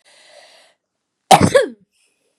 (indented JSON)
{
  "cough_length": "2.4 s",
  "cough_amplitude": 32768,
  "cough_signal_mean_std_ratio": 0.27,
  "survey_phase": "beta (2021-08-13 to 2022-03-07)",
  "age": "18-44",
  "gender": "Female",
  "wearing_mask": "No",
  "symptom_none": true,
  "smoker_status": "Never smoked",
  "respiratory_condition_asthma": true,
  "respiratory_condition_other": false,
  "recruitment_source": "REACT",
  "submission_delay": "1 day",
  "covid_test_result": "Negative",
  "covid_test_method": "RT-qPCR",
  "influenza_a_test_result": "Unknown/Void",
  "influenza_b_test_result": "Unknown/Void"
}